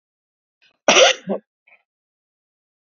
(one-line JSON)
{"cough_length": "2.9 s", "cough_amplitude": 29803, "cough_signal_mean_std_ratio": 0.26, "survey_phase": "beta (2021-08-13 to 2022-03-07)", "age": "65+", "gender": "Male", "wearing_mask": "No", "symptom_cough_any": true, "symptom_runny_or_blocked_nose": true, "symptom_onset": "12 days", "smoker_status": "Never smoked", "respiratory_condition_asthma": false, "respiratory_condition_other": false, "recruitment_source": "REACT", "submission_delay": "1 day", "covid_test_result": "Negative", "covid_test_method": "RT-qPCR"}